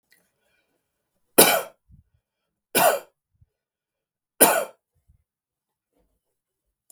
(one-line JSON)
{"three_cough_length": "6.9 s", "three_cough_amplitude": 32768, "three_cough_signal_mean_std_ratio": 0.23, "survey_phase": "beta (2021-08-13 to 2022-03-07)", "age": "45-64", "gender": "Male", "wearing_mask": "No", "symptom_none": true, "smoker_status": "Never smoked", "respiratory_condition_asthma": false, "respiratory_condition_other": false, "recruitment_source": "REACT", "submission_delay": "1 day", "covid_test_result": "Negative", "covid_test_method": "RT-qPCR"}